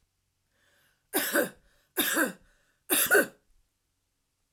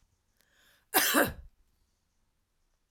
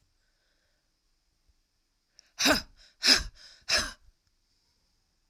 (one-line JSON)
{"three_cough_length": "4.5 s", "three_cough_amplitude": 12766, "three_cough_signal_mean_std_ratio": 0.37, "cough_length": "2.9 s", "cough_amplitude": 12038, "cough_signal_mean_std_ratio": 0.29, "exhalation_length": "5.3 s", "exhalation_amplitude": 14701, "exhalation_signal_mean_std_ratio": 0.26, "survey_phase": "beta (2021-08-13 to 2022-03-07)", "age": "45-64", "gender": "Female", "wearing_mask": "No", "symptom_headache": true, "smoker_status": "Never smoked", "respiratory_condition_asthma": false, "respiratory_condition_other": false, "recruitment_source": "Test and Trace", "submission_delay": "2 days", "covid_test_result": "Positive", "covid_test_method": "RT-qPCR", "covid_ct_value": 28.9, "covid_ct_gene": "ORF1ab gene"}